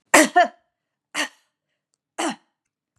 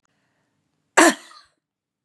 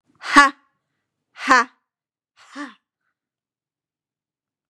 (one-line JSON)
{"three_cough_length": "3.0 s", "three_cough_amplitude": 32768, "three_cough_signal_mean_std_ratio": 0.29, "cough_length": "2.0 s", "cough_amplitude": 32640, "cough_signal_mean_std_ratio": 0.22, "exhalation_length": "4.7 s", "exhalation_amplitude": 32767, "exhalation_signal_mean_std_ratio": 0.22, "survey_phase": "beta (2021-08-13 to 2022-03-07)", "age": "45-64", "gender": "Female", "wearing_mask": "No", "symptom_none": true, "smoker_status": "Never smoked", "respiratory_condition_asthma": false, "respiratory_condition_other": false, "recruitment_source": "REACT", "submission_delay": "1 day", "covid_test_result": "Negative", "covid_test_method": "RT-qPCR", "influenza_a_test_result": "Negative", "influenza_b_test_result": "Negative"}